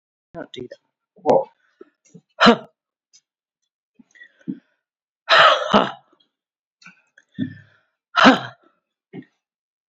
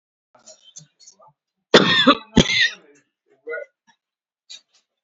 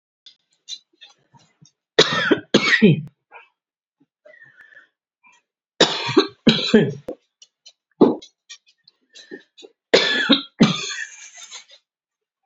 {"exhalation_length": "9.9 s", "exhalation_amplitude": 29346, "exhalation_signal_mean_std_ratio": 0.27, "cough_length": "5.0 s", "cough_amplitude": 29425, "cough_signal_mean_std_ratio": 0.29, "three_cough_length": "12.5 s", "three_cough_amplitude": 30052, "three_cough_signal_mean_std_ratio": 0.34, "survey_phase": "beta (2021-08-13 to 2022-03-07)", "age": "45-64", "gender": "Female", "wearing_mask": "No", "symptom_runny_or_blocked_nose": true, "symptom_shortness_of_breath": true, "symptom_onset": "9 days", "smoker_status": "Current smoker (1 to 10 cigarettes per day)", "respiratory_condition_asthma": true, "respiratory_condition_other": false, "recruitment_source": "REACT", "submission_delay": "1 day", "covid_test_result": "Negative", "covid_test_method": "RT-qPCR", "influenza_a_test_result": "Negative", "influenza_b_test_result": "Negative"}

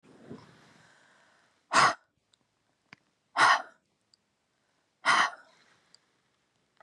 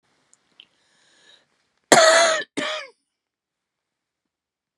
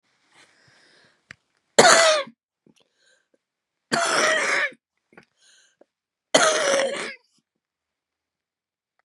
{"exhalation_length": "6.8 s", "exhalation_amplitude": 12232, "exhalation_signal_mean_std_ratio": 0.26, "cough_length": "4.8 s", "cough_amplitude": 32768, "cough_signal_mean_std_ratio": 0.28, "three_cough_length": "9.0 s", "three_cough_amplitude": 32767, "three_cough_signal_mean_std_ratio": 0.35, "survey_phase": "beta (2021-08-13 to 2022-03-07)", "age": "65+", "gender": "Female", "wearing_mask": "No", "symptom_cough_any": true, "symptom_onset": "14 days", "smoker_status": "Ex-smoker", "respiratory_condition_asthma": false, "respiratory_condition_other": false, "recruitment_source": "Test and Trace", "submission_delay": "1 day", "covid_test_result": "Positive", "covid_test_method": "RT-qPCR", "covid_ct_value": 19.9, "covid_ct_gene": "ORF1ab gene"}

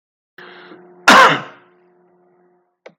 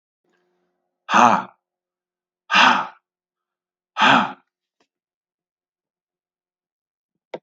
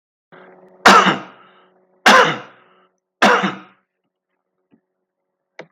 {"cough_length": "3.0 s", "cough_amplitude": 32768, "cough_signal_mean_std_ratio": 0.29, "exhalation_length": "7.4 s", "exhalation_amplitude": 32768, "exhalation_signal_mean_std_ratio": 0.27, "three_cough_length": "5.7 s", "three_cough_amplitude": 32768, "three_cough_signal_mean_std_ratio": 0.32, "survey_phase": "beta (2021-08-13 to 2022-03-07)", "age": "45-64", "gender": "Male", "wearing_mask": "No", "symptom_cough_any": true, "symptom_sore_throat": true, "symptom_headache": true, "symptom_onset": "5 days", "smoker_status": "Current smoker (1 to 10 cigarettes per day)", "respiratory_condition_asthma": false, "respiratory_condition_other": false, "recruitment_source": "Test and Trace", "submission_delay": "2 days", "covid_test_result": "Positive", "covid_test_method": "ePCR"}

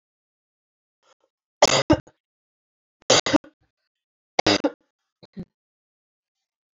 {"three_cough_length": "6.8 s", "three_cough_amplitude": 28096, "three_cough_signal_mean_std_ratio": 0.23, "survey_phase": "beta (2021-08-13 to 2022-03-07)", "age": "18-44", "gender": "Female", "wearing_mask": "No", "symptom_none": true, "smoker_status": "Ex-smoker", "respiratory_condition_asthma": false, "respiratory_condition_other": false, "recruitment_source": "REACT", "submission_delay": "3 days", "covid_test_result": "Negative", "covid_test_method": "RT-qPCR", "influenza_a_test_result": "Negative", "influenza_b_test_result": "Negative"}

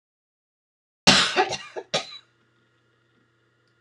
{"cough_length": "3.8 s", "cough_amplitude": 26028, "cough_signal_mean_std_ratio": 0.28, "survey_phase": "beta (2021-08-13 to 2022-03-07)", "age": "65+", "gender": "Female", "wearing_mask": "No", "symptom_none": true, "smoker_status": "Never smoked", "respiratory_condition_asthma": false, "respiratory_condition_other": false, "recruitment_source": "REACT", "submission_delay": "3 days", "covid_test_result": "Negative", "covid_test_method": "RT-qPCR"}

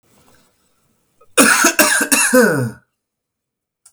{"cough_length": "3.9 s", "cough_amplitude": 32768, "cough_signal_mean_std_ratio": 0.46, "survey_phase": "beta (2021-08-13 to 2022-03-07)", "age": "18-44", "gender": "Male", "wearing_mask": "No", "symptom_none": true, "smoker_status": "Never smoked", "respiratory_condition_asthma": true, "respiratory_condition_other": false, "recruitment_source": "REACT", "submission_delay": "12 days", "covid_test_result": "Negative", "covid_test_method": "RT-qPCR", "influenza_a_test_result": "Negative", "influenza_b_test_result": "Negative"}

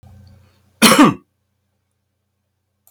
{"cough_length": "2.9 s", "cough_amplitude": 32768, "cough_signal_mean_std_ratio": 0.27, "survey_phase": "alpha (2021-03-01 to 2021-08-12)", "age": "45-64", "gender": "Male", "wearing_mask": "No", "symptom_none": true, "smoker_status": "Never smoked", "respiratory_condition_asthma": false, "respiratory_condition_other": false, "recruitment_source": "REACT", "submission_delay": "1 day", "covid_test_result": "Negative", "covid_test_method": "RT-qPCR"}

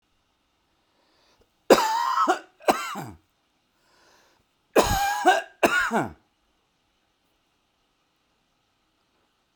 {"cough_length": "9.6 s", "cough_amplitude": 30249, "cough_signal_mean_std_ratio": 0.34, "survey_phase": "beta (2021-08-13 to 2022-03-07)", "age": "45-64", "gender": "Male", "wearing_mask": "No", "symptom_none": true, "smoker_status": "Never smoked", "respiratory_condition_asthma": false, "respiratory_condition_other": false, "recruitment_source": "REACT", "submission_delay": "10 days", "covid_test_result": "Negative", "covid_test_method": "RT-qPCR"}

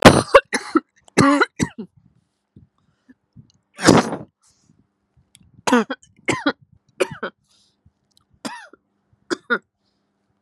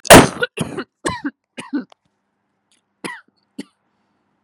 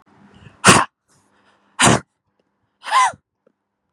{"three_cough_length": "10.4 s", "three_cough_amplitude": 32768, "three_cough_signal_mean_std_ratio": 0.28, "cough_length": "4.4 s", "cough_amplitude": 32768, "cough_signal_mean_std_ratio": 0.24, "exhalation_length": "3.9 s", "exhalation_amplitude": 32768, "exhalation_signal_mean_std_ratio": 0.31, "survey_phase": "beta (2021-08-13 to 2022-03-07)", "age": "18-44", "gender": "Female", "wearing_mask": "No", "symptom_none": true, "smoker_status": "Never smoked", "respiratory_condition_asthma": false, "respiratory_condition_other": false, "recruitment_source": "REACT", "submission_delay": "3 days", "covid_test_result": "Negative", "covid_test_method": "RT-qPCR", "influenza_a_test_result": "Negative", "influenza_b_test_result": "Negative"}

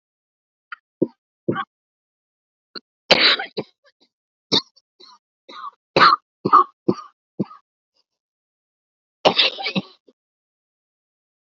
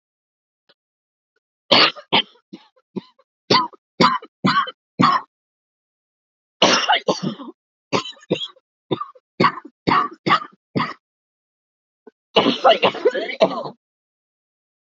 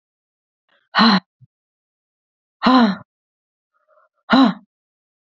{"cough_length": "11.5 s", "cough_amplitude": 30480, "cough_signal_mean_std_ratio": 0.26, "three_cough_length": "14.9 s", "three_cough_amplitude": 29076, "three_cough_signal_mean_std_ratio": 0.37, "exhalation_length": "5.2 s", "exhalation_amplitude": 28433, "exhalation_signal_mean_std_ratio": 0.32, "survey_phase": "alpha (2021-03-01 to 2021-08-12)", "age": "45-64", "gender": "Female", "wearing_mask": "No", "symptom_cough_any": true, "symptom_new_continuous_cough": true, "symptom_shortness_of_breath": true, "symptom_fatigue": true, "symptom_headache": true, "symptom_change_to_sense_of_smell_or_taste": true, "symptom_onset": "6 days", "smoker_status": "Never smoked", "respiratory_condition_asthma": false, "respiratory_condition_other": false, "recruitment_source": "Test and Trace", "submission_delay": "2 days", "covid_test_result": "Positive", "covid_test_method": "RT-qPCR", "covid_ct_value": 15.8, "covid_ct_gene": "ORF1ab gene", "covid_ct_mean": 15.8, "covid_viral_load": "6600000 copies/ml", "covid_viral_load_category": "High viral load (>1M copies/ml)"}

